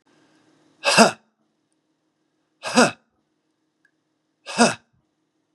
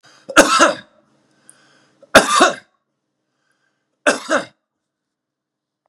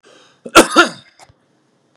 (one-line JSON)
{"exhalation_length": "5.5 s", "exhalation_amplitude": 32767, "exhalation_signal_mean_std_ratio": 0.25, "three_cough_length": "5.9 s", "three_cough_amplitude": 32768, "three_cough_signal_mean_std_ratio": 0.3, "cough_length": "2.0 s", "cough_amplitude": 32768, "cough_signal_mean_std_ratio": 0.29, "survey_phase": "beta (2021-08-13 to 2022-03-07)", "age": "45-64", "gender": "Male", "wearing_mask": "No", "symptom_runny_or_blocked_nose": true, "symptom_sore_throat": true, "smoker_status": "Never smoked", "respiratory_condition_asthma": false, "respiratory_condition_other": false, "recruitment_source": "REACT", "submission_delay": "0 days", "covid_test_result": "Negative", "covid_test_method": "RT-qPCR", "influenza_a_test_result": "Negative", "influenza_b_test_result": "Negative"}